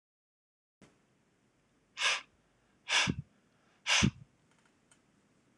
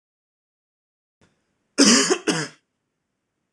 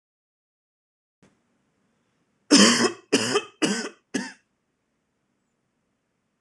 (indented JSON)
{
  "exhalation_length": "5.6 s",
  "exhalation_amplitude": 6369,
  "exhalation_signal_mean_std_ratio": 0.29,
  "cough_length": "3.5 s",
  "cough_amplitude": 25945,
  "cough_signal_mean_std_ratio": 0.3,
  "three_cough_length": "6.4 s",
  "three_cough_amplitude": 24838,
  "three_cough_signal_mean_std_ratio": 0.28,
  "survey_phase": "beta (2021-08-13 to 2022-03-07)",
  "age": "18-44",
  "gender": "Male",
  "wearing_mask": "No",
  "symptom_cough_any": true,
  "symptom_runny_or_blocked_nose": true,
  "symptom_fatigue": true,
  "symptom_fever_high_temperature": true,
  "symptom_other": true,
  "symptom_onset": "7 days",
  "smoker_status": "Never smoked",
  "respiratory_condition_asthma": false,
  "respiratory_condition_other": false,
  "recruitment_source": "Test and Trace",
  "submission_delay": "2 days",
  "covid_test_result": "Positive",
  "covid_test_method": "RT-qPCR"
}